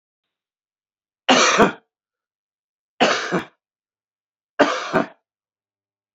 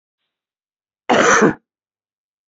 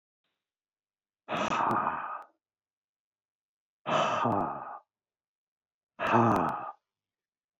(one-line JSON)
{"three_cough_length": "6.1 s", "three_cough_amplitude": 32188, "three_cough_signal_mean_std_ratio": 0.33, "cough_length": "2.5 s", "cough_amplitude": 27759, "cough_signal_mean_std_ratio": 0.34, "exhalation_length": "7.6 s", "exhalation_amplitude": 8278, "exhalation_signal_mean_std_ratio": 0.44, "survey_phase": "beta (2021-08-13 to 2022-03-07)", "age": "45-64", "gender": "Male", "wearing_mask": "No", "symptom_cough_any": true, "smoker_status": "Never smoked", "respiratory_condition_asthma": false, "respiratory_condition_other": false, "recruitment_source": "REACT", "submission_delay": "2 days", "covid_test_result": "Negative", "covid_test_method": "RT-qPCR", "influenza_a_test_result": "Negative", "influenza_b_test_result": "Negative"}